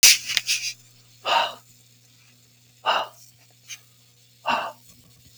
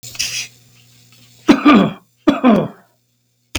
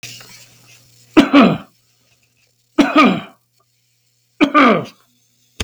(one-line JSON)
{"exhalation_length": "5.4 s", "exhalation_amplitude": 32766, "exhalation_signal_mean_std_ratio": 0.34, "cough_length": "3.6 s", "cough_amplitude": 32768, "cough_signal_mean_std_ratio": 0.41, "three_cough_length": "5.6 s", "three_cough_amplitude": 32768, "three_cough_signal_mean_std_ratio": 0.37, "survey_phase": "beta (2021-08-13 to 2022-03-07)", "age": "45-64", "gender": "Male", "wearing_mask": "No", "symptom_none": true, "smoker_status": "Ex-smoker", "respiratory_condition_asthma": true, "respiratory_condition_other": false, "recruitment_source": "REACT", "submission_delay": "7 days", "covid_test_result": "Negative", "covid_test_method": "RT-qPCR", "influenza_a_test_result": "Unknown/Void", "influenza_b_test_result": "Unknown/Void"}